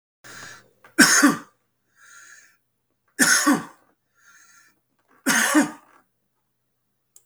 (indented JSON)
{
  "three_cough_length": "7.3 s",
  "three_cough_amplitude": 32768,
  "three_cough_signal_mean_std_ratio": 0.33,
  "survey_phase": "beta (2021-08-13 to 2022-03-07)",
  "age": "65+",
  "gender": "Male",
  "wearing_mask": "No",
  "symptom_none": true,
  "smoker_status": "Ex-smoker",
  "respiratory_condition_asthma": false,
  "respiratory_condition_other": false,
  "recruitment_source": "REACT",
  "submission_delay": "1 day",
  "covid_test_result": "Negative",
  "covid_test_method": "RT-qPCR",
  "influenza_a_test_result": "Negative",
  "influenza_b_test_result": "Negative"
}